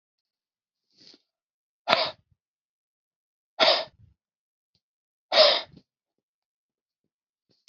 {
  "exhalation_length": "7.7 s",
  "exhalation_amplitude": 32768,
  "exhalation_signal_mean_std_ratio": 0.23,
  "survey_phase": "beta (2021-08-13 to 2022-03-07)",
  "age": "45-64",
  "gender": "Male",
  "wearing_mask": "No",
  "symptom_runny_or_blocked_nose": true,
  "symptom_headache": true,
  "smoker_status": "Never smoked",
  "respiratory_condition_asthma": false,
  "respiratory_condition_other": false,
  "recruitment_source": "REACT",
  "submission_delay": "1 day",
  "covid_test_result": "Negative",
  "covid_test_method": "RT-qPCR"
}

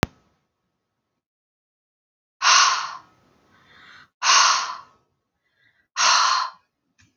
{
  "exhalation_length": "7.2 s",
  "exhalation_amplitude": 32768,
  "exhalation_signal_mean_std_ratio": 0.36,
  "survey_phase": "beta (2021-08-13 to 2022-03-07)",
  "age": "45-64",
  "gender": "Female",
  "wearing_mask": "No",
  "symptom_none": true,
  "smoker_status": "Never smoked",
  "respiratory_condition_asthma": false,
  "respiratory_condition_other": false,
  "recruitment_source": "REACT",
  "submission_delay": "6 days",
  "covid_test_result": "Negative",
  "covid_test_method": "RT-qPCR",
  "influenza_a_test_result": "Negative",
  "influenza_b_test_result": "Negative"
}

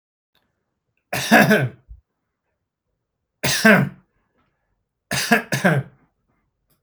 {
  "three_cough_length": "6.8 s",
  "three_cough_amplitude": 28809,
  "three_cough_signal_mean_std_ratio": 0.35,
  "survey_phase": "beta (2021-08-13 to 2022-03-07)",
  "age": "45-64",
  "gender": "Male",
  "wearing_mask": "No",
  "symptom_none": true,
  "smoker_status": "Never smoked",
  "respiratory_condition_asthma": true,
  "respiratory_condition_other": false,
  "recruitment_source": "REACT",
  "submission_delay": "3 days",
  "covid_test_result": "Negative",
  "covid_test_method": "RT-qPCR",
  "influenza_a_test_result": "Negative",
  "influenza_b_test_result": "Negative"
}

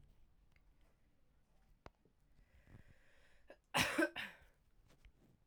{
  "cough_length": "5.5 s",
  "cough_amplitude": 3233,
  "cough_signal_mean_std_ratio": 0.27,
  "survey_phase": "beta (2021-08-13 to 2022-03-07)",
  "age": "18-44",
  "gender": "Female",
  "wearing_mask": "No",
  "symptom_runny_or_blocked_nose": true,
  "symptom_change_to_sense_of_smell_or_taste": true,
  "symptom_loss_of_taste": true,
  "symptom_onset": "2 days",
  "smoker_status": "Never smoked",
  "respiratory_condition_asthma": false,
  "respiratory_condition_other": false,
  "recruitment_source": "Test and Trace",
  "submission_delay": "2 days",
  "covid_test_result": "Positive",
  "covid_test_method": "RT-qPCR",
  "covid_ct_value": 15.6,
  "covid_ct_gene": "ORF1ab gene",
  "covid_ct_mean": 15.9,
  "covid_viral_load": "6200000 copies/ml",
  "covid_viral_load_category": "High viral load (>1M copies/ml)"
}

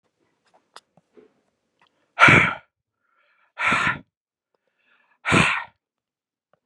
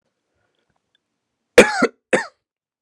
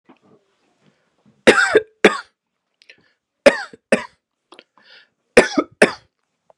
{
  "exhalation_length": "6.7 s",
  "exhalation_amplitude": 31853,
  "exhalation_signal_mean_std_ratio": 0.29,
  "cough_length": "2.8 s",
  "cough_amplitude": 32768,
  "cough_signal_mean_std_ratio": 0.23,
  "three_cough_length": "6.6 s",
  "three_cough_amplitude": 32768,
  "three_cough_signal_mean_std_ratio": 0.26,
  "survey_phase": "beta (2021-08-13 to 2022-03-07)",
  "age": "18-44",
  "gender": "Male",
  "wearing_mask": "No",
  "symptom_none": true,
  "smoker_status": "Never smoked",
  "respiratory_condition_asthma": false,
  "respiratory_condition_other": false,
  "recruitment_source": "REACT",
  "submission_delay": "4 days",
  "covid_test_result": "Negative",
  "covid_test_method": "RT-qPCR",
  "influenza_a_test_result": "Negative",
  "influenza_b_test_result": "Negative"
}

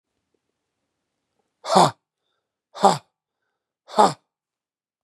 {
  "exhalation_length": "5.0 s",
  "exhalation_amplitude": 31969,
  "exhalation_signal_mean_std_ratio": 0.23,
  "survey_phase": "beta (2021-08-13 to 2022-03-07)",
  "age": "45-64",
  "gender": "Male",
  "wearing_mask": "No",
  "symptom_cough_any": true,
  "symptom_runny_or_blocked_nose": true,
  "symptom_fatigue": true,
  "symptom_headache": true,
  "symptom_change_to_sense_of_smell_or_taste": true,
  "symptom_onset": "4 days",
  "smoker_status": "Never smoked",
  "respiratory_condition_asthma": false,
  "respiratory_condition_other": false,
  "recruitment_source": "Test and Trace",
  "submission_delay": "2 days",
  "covid_test_result": "Positive",
  "covid_test_method": "ePCR"
}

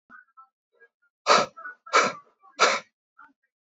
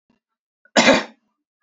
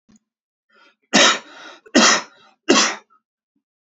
{
  "exhalation_length": "3.7 s",
  "exhalation_amplitude": 18544,
  "exhalation_signal_mean_std_ratio": 0.32,
  "cough_length": "1.6 s",
  "cough_amplitude": 29774,
  "cough_signal_mean_std_ratio": 0.31,
  "three_cough_length": "3.8 s",
  "three_cough_amplitude": 29957,
  "three_cough_signal_mean_std_ratio": 0.36,
  "survey_phase": "beta (2021-08-13 to 2022-03-07)",
  "age": "18-44",
  "gender": "Male",
  "wearing_mask": "No",
  "symptom_runny_or_blocked_nose": true,
  "symptom_fatigue": true,
  "symptom_fever_high_temperature": true,
  "symptom_headache": true,
  "symptom_other": true,
  "symptom_onset": "3 days",
  "smoker_status": "Never smoked",
  "respiratory_condition_asthma": false,
  "respiratory_condition_other": false,
  "recruitment_source": "Test and Trace",
  "submission_delay": "1 day",
  "covid_test_result": "Positive",
  "covid_test_method": "RT-qPCR",
  "covid_ct_value": 29.4,
  "covid_ct_gene": "ORF1ab gene"
}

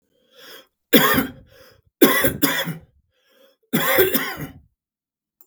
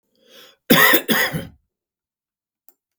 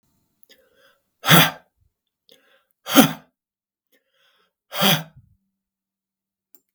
{
  "three_cough_length": "5.5 s",
  "three_cough_amplitude": 32768,
  "three_cough_signal_mean_std_ratio": 0.42,
  "cough_length": "3.0 s",
  "cough_amplitude": 32768,
  "cough_signal_mean_std_ratio": 0.35,
  "exhalation_length": "6.7 s",
  "exhalation_amplitude": 32768,
  "exhalation_signal_mean_std_ratio": 0.23,
  "survey_phase": "beta (2021-08-13 to 2022-03-07)",
  "age": "45-64",
  "gender": "Male",
  "wearing_mask": "No",
  "symptom_none": true,
  "symptom_onset": "10 days",
  "smoker_status": "Never smoked",
  "respiratory_condition_asthma": true,
  "respiratory_condition_other": false,
  "recruitment_source": "REACT",
  "submission_delay": "1 day",
  "covid_test_result": "Negative",
  "covid_test_method": "RT-qPCR",
  "influenza_a_test_result": "Unknown/Void",
  "influenza_b_test_result": "Unknown/Void"
}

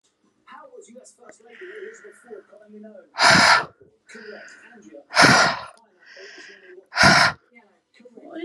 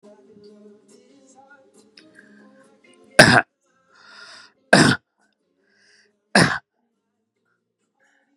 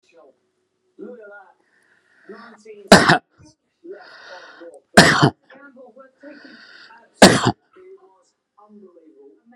{
  "exhalation_length": "8.4 s",
  "exhalation_amplitude": 31502,
  "exhalation_signal_mean_std_ratio": 0.35,
  "three_cough_length": "8.4 s",
  "three_cough_amplitude": 32768,
  "three_cough_signal_mean_std_ratio": 0.22,
  "cough_length": "9.6 s",
  "cough_amplitude": 32768,
  "cough_signal_mean_std_ratio": 0.24,
  "survey_phase": "beta (2021-08-13 to 2022-03-07)",
  "age": "45-64",
  "gender": "Male",
  "wearing_mask": "Prefer not to say",
  "symptom_none": true,
  "smoker_status": "Never smoked",
  "respiratory_condition_asthma": false,
  "respiratory_condition_other": false,
  "recruitment_source": "REACT",
  "submission_delay": "10 days",
  "covid_test_result": "Negative",
  "covid_test_method": "RT-qPCR"
}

